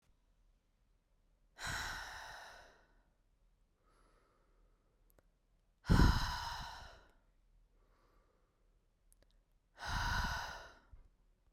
{"exhalation_length": "11.5 s", "exhalation_amplitude": 5304, "exhalation_signal_mean_std_ratio": 0.3, "survey_phase": "beta (2021-08-13 to 2022-03-07)", "age": "18-44", "gender": "Female", "wearing_mask": "No", "symptom_cough_any": true, "symptom_sore_throat": true, "symptom_diarrhoea": true, "symptom_fatigue": true, "smoker_status": "Never smoked", "respiratory_condition_asthma": false, "respiratory_condition_other": false, "recruitment_source": "Test and Trace", "submission_delay": "1 day", "covid_test_result": "Positive", "covid_test_method": "RT-qPCR", "covid_ct_value": 22.5, "covid_ct_gene": "ORF1ab gene", "covid_ct_mean": 23.4, "covid_viral_load": "22000 copies/ml", "covid_viral_load_category": "Low viral load (10K-1M copies/ml)"}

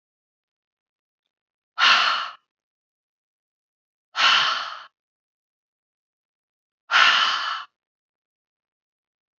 {"exhalation_length": "9.4 s", "exhalation_amplitude": 24838, "exhalation_signal_mean_std_ratio": 0.32, "survey_phase": "beta (2021-08-13 to 2022-03-07)", "age": "18-44", "gender": "Female", "wearing_mask": "No", "symptom_runny_or_blocked_nose": true, "symptom_sore_throat": true, "symptom_other": true, "smoker_status": "Never smoked", "respiratory_condition_asthma": false, "respiratory_condition_other": false, "recruitment_source": "Test and Trace", "submission_delay": "1 day", "covid_test_result": "Negative", "covid_test_method": "RT-qPCR"}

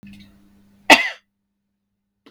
{"cough_length": "2.3 s", "cough_amplitude": 32768, "cough_signal_mean_std_ratio": 0.2, "survey_phase": "beta (2021-08-13 to 2022-03-07)", "age": "18-44", "gender": "Female", "wearing_mask": "No", "symptom_none": true, "smoker_status": "Never smoked", "respiratory_condition_asthma": false, "respiratory_condition_other": false, "recruitment_source": "REACT", "submission_delay": "3 days", "covid_test_result": "Negative", "covid_test_method": "RT-qPCR"}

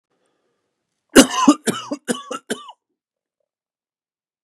{"three_cough_length": "4.4 s", "three_cough_amplitude": 32768, "three_cough_signal_mean_std_ratio": 0.25, "survey_phase": "beta (2021-08-13 to 2022-03-07)", "age": "18-44", "gender": "Male", "wearing_mask": "No", "symptom_none": true, "symptom_onset": "5 days", "smoker_status": "Never smoked", "respiratory_condition_asthma": false, "respiratory_condition_other": false, "recruitment_source": "Test and Trace", "submission_delay": "2 days", "covid_test_result": "Positive", "covid_test_method": "RT-qPCR", "covid_ct_value": 18.1, "covid_ct_gene": "ORF1ab gene", "covid_ct_mean": 18.4, "covid_viral_load": "890000 copies/ml", "covid_viral_load_category": "Low viral load (10K-1M copies/ml)"}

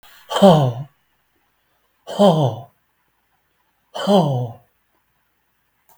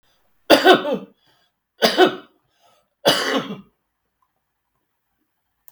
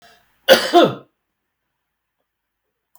{"exhalation_length": "6.0 s", "exhalation_amplitude": 32766, "exhalation_signal_mean_std_ratio": 0.37, "three_cough_length": "5.7 s", "three_cough_amplitude": 32768, "three_cough_signal_mean_std_ratio": 0.32, "cough_length": "3.0 s", "cough_amplitude": 32768, "cough_signal_mean_std_ratio": 0.26, "survey_phase": "beta (2021-08-13 to 2022-03-07)", "age": "65+", "gender": "Male", "wearing_mask": "No", "symptom_cough_any": true, "symptom_runny_or_blocked_nose": true, "symptom_fatigue": true, "symptom_onset": "10 days", "smoker_status": "Ex-smoker", "respiratory_condition_asthma": false, "respiratory_condition_other": true, "recruitment_source": "REACT", "submission_delay": "2 days", "covid_test_result": "Negative", "covid_test_method": "RT-qPCR", "influenza_a_test_result": "Negative", "influenza_b_test_result": "Negative"}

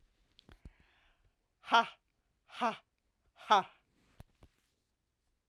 {"exhalation_length": "5.5 s", "exhalation_amplitude": 8202, "exhalation_signal_mean_std_ratio": 0.21, "survey_phase": "alpha (2021-03-01 to 2021-08-12)", "age": "65+", "gender": "Female", "wearing_mask": "No", "symptom_none": true, "smoker_status": "Ex-smoker", "respiratory_condition_asthma": false, "respiratory_condition_other": false, "recruitment_source": "REACT", "submission_delay": "2 days", "covid_test_result": "Negative", "covid_test_method": "RT-qPCR"}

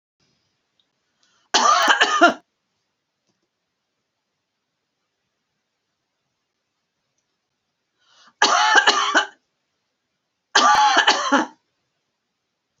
{"three_cough_length": "12.8 s", "three_cough_amplitude": 32767, "three_cough_signal_mean_std_ratio": 0.35, "survey_phase": "alpha (2021-03-01 to 2021-08-12)", "age": "65+", "gender": "Female", "wearing_mask": "No", "symptom_none": true, "smoker_status": "Never smoked", "respiratory_condition_asthma": false, "respiratory_condition_other": false, "recruitment_source": "REACT", "submission_delay": "4 days", "covid_test_result": "Negative", "covid_test_method": "RT-qPCR"}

